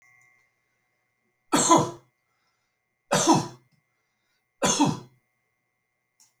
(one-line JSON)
{"three_cough_length": "6.4 s", "three_cough_amplitude": 17915, "three_cough_signal_mean_std_ratio": 0.31, "survey_phase": "alpha (2021-03-01 to 2021-08-12)", "age": "65+", "gender": "Male", "wearing_mask": "No", "symptom_none": true, "smoker_status": "Never smoked", "respiratory_condition_asthma": false, "respiratory_condition_other": false, "recruitment_source": "REACT", "submission_delay": "1 day", "covid_test_result": "Negative", "covid_test_method": "RT-qPCR"}